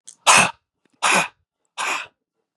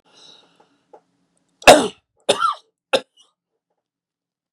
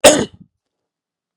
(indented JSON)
{
  "exhalation_length": "2.6 s",
  "exhalation_amplitude": 31616,
  "exhalation_signal_mean_std_ratio": 0.39,
  "three_cough_length": "4.5 s",
  "three_cough_amplitude": 32768,
  "three_cough_signal_mean_std_ratio": 0.21,
  "cough_length": "1.4 s",
  "cough_amplitude": 32768,
  "cough_signal_mean_std_ratio": 0.29,
  "survey_phase": "beta (2021-08-13 to 2022-03-07)",
  "age": "65+",
  "gender": "Male",
  "wearing_mask": "No",
  "symptom_none": true,
  "smoker_status": "Never smoked",
  "respiratory_condition_asthma": false,
  "respiratory_condition_other": false,
  "recruitment_source": "REACT",
  "submission_delay": "2 days",
  "covid_test_result": "Negative",
  "covid_test_method": "RT-qPCR",
  "influenza_a_test_result": "Negative",
  "influenza_b_test_result": "Negative"
}